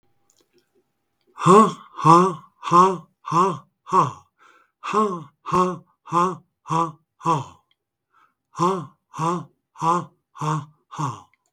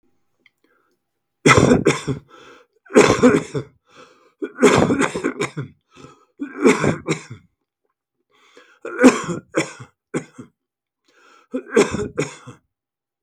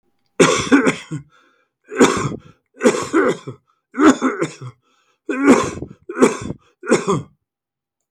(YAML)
exhalation_length: 11.5 s
exhalation_amplitude: 31960
exhalation_signal_mean_std_ratio: 0.42
three_cough_length: 13.2 s
three_cough_amplitude: 32768
three_cough_signal_mean_std_ratio: 0.38
cough_length: 8.1 s
cough_amplitude: 32768
cough_signal_mean_std_ratio: 0.46
survey_phase: beta (2021-08-13 to 2022-03-07)
age: 65+
gender: Male
wearing_mask: 'No'
symptom_other: true
smoker_status: Ex-smoker
respiratory_condition_asthma: false
respiratory_condition_other: false
recruitment_source: Test and Trace
submission_delay: 1 day
covid_test_result: Negative
covid_test_method: RT-qPCR